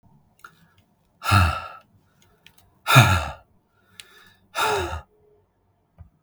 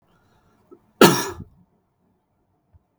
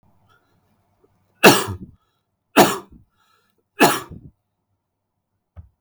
{"exhalation_length": "6.2 s", "exhalation_amplitude": 32768, "exhalation_signal_mean_std_ratio": 0.32, "cough_length": "3.0 s", "cough_amplitude": 32768, "cough_signal_mean_std_ratio": 0.2, "three_cough_length": "5.8 s", "three_cough_amplitude": 32768, "three_cough_signal_mean_std_ratio": 0.25, "survey_phase": "beta (2021-08-13 to 2022-03-07)", "age": "18-44", "gender": "Male", "wearing_mask": "No", "symptom_runny_or_blocked_nose": true, "symptom_onset": "12 days", "smoker_status": "Never smoked", "respiratory_condition_asthma": false, "respiratory_condition_other": false, "recruitment_source": "REACT", "submission_delay": "4 days", "covid_test_result": "Negative", "covid_test_method": "RT-qPCR", "influenza_a_test_result": "Negative", "influenza_b_test_result": "Negative"}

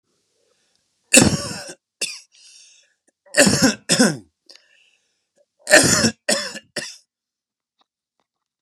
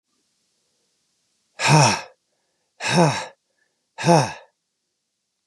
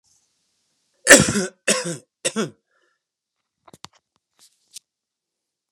{"three_cough_length": "8.6 s", "three_cough_amplitude": 32768, "three_cough_signal_mean_std_ratio": 0.33, "exhalation_length": "5.5 s", "exhalation_amplitude": 28663, "exhalation_signal_mean_std_ratio": 0.34, "cough_length": "5.7 s", "cough_amplitude": 32768, "cough_signal_mean_std_ratio": 0.22, "survey_phase": "beta (2021-08-13 to 2022-03-07)", "age": "18-44", "gender": "Male", "wearing_mask": "No", "symptom_cough_any": true, "symptom_runny_or_blocked_nose": true, "symptom_fatigue": true, "symptom_onset": "4 days", "smoker_status": "Current smoker (e-cigarettes or vapes only)", "respiratory_condition_asthma": false, "respiratory_condition_other": false, "recruitment_source": "Test and Trace", "submission_delay": "2 days", "covid_test_result": "Positive", "covid_test_method": "RT-qPCR", "covid_ct_value": 20.6, "covid_ct_gene": "N gene"}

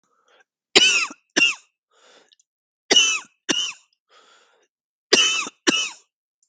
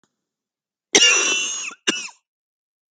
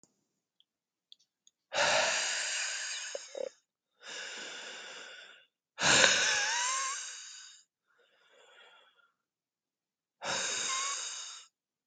{"three_cough_length": "6.5 s", "three_cough_amplitude": 32768, "three_cough_signal_mean_std_ratio": 0.37, "cough_length": "2.9 s", "cough_amplitude": 32768, "cough_signal_mean_std_ratio": 0.41, "exhalation_length": "11.9 s", "exhalation_amplitude": 22266, "exhalation_signal_mean_std_ratio": 0.47, "survey_phase": "beta (2021-08-13 to 2022-03-07)", "age": "45-64", "gender": "Male", "wearing_mask": "No", "symptom_runny_or_blocked_nose": true, "symptom_diarrhoea": true, "symptom_fatigue": true, "symptom_headache": true, "symptom_change_to_sense_of_smell_or_taste": true, "symptom_loss_of_taste": true, "symptom_other": true, "smoker_status": "Never smoked", "respiratory_condition_asthma": false, "respiratory_condition_other": false, "recruitment_source": "Test and Trace", "submission_delay": "1 day", "covid_test_result": "Positive", "covid_test_method": "RT-qPCR", "covid_ct_value": 29.4, "covid_ct_gene": "N gene", "covid_ct_mean": 29.5, "covid_viral_load": "210 copies/ml", "covid_viral_load_category": "Minimal viral load (< 10K copies/ml)"}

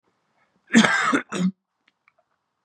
{"cough_length": "2.6 s", "cough_amplitude": 28817, "cough_signal_mean_std_ratio": 0.38, "survey_phase": "beta (2021-08-13 to 2022-03-07)", "age": "18-44", "gender": "Male", "wearing_mask": "No", "symptom_cough_any": true, "symptom_new_continuous_cough": true, "symptom_runny_or_blocked_nose": true, "symptom_sore_throat": true, "symptom_fatigue": true, "symptom_fever_high_temperature": true, "symptom_headache": true, "symptom_onset": "4 days", "smoker_status": "Never smoked", "respiratory_condition_asthma": false, "respiratory_condition_other": false, "recruitment_source": "Test and Trace", "submission_delay": "2 days", "covid_test_result": "Positive", "covid_test_method": "RT-qPCR", "covid_ct_value": 12.3, "covid_ct_gene": "N gene", "covid_ct_mean": 12.6, "covid_viral_load": "76000000 copies/ml", "covid_viral_load_category": "High viral load (>1M copies/ml)"}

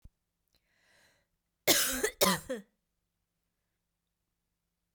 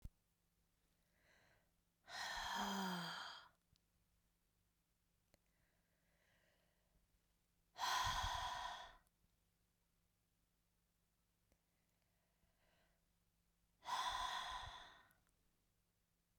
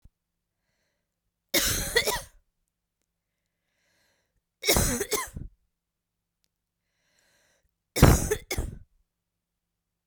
{"cough_length": "4.9 s", "cough_amplitude": 10393, "cough_signal_mean_std_ratio": 0.27, "exhalation_length": "16.4 s", "exhalation_amplitude": 1007, "exhalation_signal_mean_std_ratio": 0.38, "three_cough_length": "10.1 s", "three_cough_amplitude": 26311, "three_cough_signal_mean_std_ratio": 0.28, "survey_phase": "beta (2021-08-13 to 2022-03-07)", "age": "18-44", "gender": "Female", "wearing_mask": "No", "symptom_fatigue": true, "symptom_change_to_sense_of_smell_or_taste": true, "symptom_onset": "8 days", "smoker_status": "Never smoked", "respiratory_condition_asthma": false, "respiratory_condition_other": false, "recruitment_source": "Test and Trace", "submission_delay": "2 days", "covid_test_result": "Positive", "covid_test_method": "ePCR"}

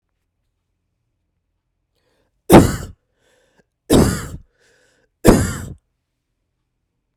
{"three_cough_length": "7.2 s", "three_cough_amplitude": 32768, "three_cough_signal_mean_std_ratio": 0.25, "survey_phase": "beta (2021-08-13 to 2022-03-07)", "age": "18-44", "gender": "Female", "wearing_mask": "No", "symptom_cough_any": true, "symptom_runny_or_blocked_nose": true, "symptom_headache": true, "symptom_change_to_sense_of_smell_or_taste": true, "symptom_onset": "4 days", "smoker_status": "Never smoked", "respiratory_condition_asthma": false, "respiratory_condition_other": false, "recruitment_source": "Test and Trace", "submission_delay": "2 days", "covid_test_result": "Positive", "covid_test_method": "RT-qPCR", "covid_ct_value": 20.3, "covid_ct_gene": "N gene", "covid_ct_mean": 21.1, "covid_viral_load": "120000 copies/ml", "covid_viral_load_category": "Low viral load (10K-1M copies/ml)"}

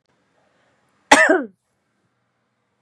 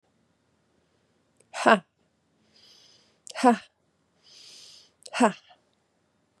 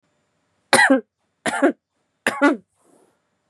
{"cough_length": "2.8 s", "cough_amplitude": 32768, "cough_signal_mean_std_ratio": 0.25, "exhalation_length": "6.4 s", "exhalation_amplitude": 25019, "exhalation_signal_mean_std_ratio": 0.21, "three_cough_length": "3.5 s", "three_cough_amplitude": 30140, "three_cough_signal_mean_std_ratio": 0.36, "survey_phase": "beta (2021-08-13 to 2022-03-07)", "age": "18-44", "gender": "Female", "wearing_mask": "No", "symptom_cough_any": true, "symptom_runny_or_blocked_nose": true, "symptom_sore_throat": true, "symptom_fatigue": true, "smoker_status": "Never smoked", "respiratory_condition_asthma": false, "respiratory_condition_other": false, "recruitment_source": "Test and Trace", "submission_delay": "2 days", "covid_test_result": "Positive", "covid_test_method": "ePCR"}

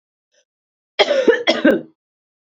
{"cough_length": "2.5 s", "cough_amplitude": 29972, "cough_signal_mean_std_ratio": 0.41, "survey_phase": "beta (2021-08-13 to 2022-03-07)", "age": "18-44", "gender": "Female", "wearing_mask": "No", "symptom_runny_or_blocked_nose": true, "symptom_fatigue": true, "symptom_change_to_sense_of_smell_or_taste": true, "symptom_onset": "6 days", "smoker_status": "Never smoked", "respiratory_condition_asthma": false, "respiratory_condition_other": false, "recruitment_source": "Test and Trace", "submission_delay": "2 days", "covid_test_result": "Positive", "covid_test_method": "RT-qPCR", "covid_ct_value": 23.6, "covid_ct_gene": "N gene"}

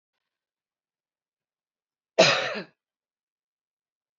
{"cough_length": "4.2 s", "cough_amplitude": 20639, "cough_signal_mean_std_ratio": 0.21, "survey_phase": "beta (2021-08-13 to 2022-03-07)", "age": "18-44", "gender": "Female", "wearing_mask": "No", "symptom_none": true, "smoker_status": "Current smoker (11 or more cigarettes per day)", "respiratory_condition_asthma": false, "respiratory_condition_other": false, "recruitment_source": "REACT", "submission_delay": "3 days", "covid_test_result": "Negative", "covid_test_method": "RT-qPCR", "influenza_a_test_result": "Negative", "influenza_b_test_result": "Negative"}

